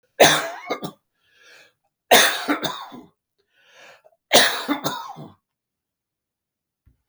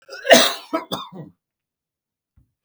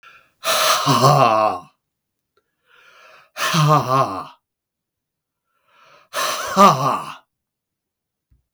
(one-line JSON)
{"three_cough_length": "7.1 s", "three_cough_amplitude": 32768, "three_cough_signal_mean_std_ratio": 0.33, "cough_length": "2.6 s", "cough_amplitude": 32768, "cough_signal_mean_std_ratio": 0.29, "exhalation_length": "8.5 s", "exhalation_amplitude": 32766, "exhalation_signal_mean_std_ratio": 0.44, "survey_phase": "beta (2021-08-13 to 2022-03-07)", "age": "65+", "gender": "Male", "wearing_mask": "No", "symptom_cough_any": true, "symptom_runny_or_blocked_nose": true, "symptom_onset": "3 days", "smoker_status": "Never smoked", "respiratory_condition_asthma": false, "respiratory_condition_other": false, "recruitment_source": "Test and Trace", "submission_delay": "1 day", "covid_test_result": "Negative", "covid_test_method": "RT-qPCR"}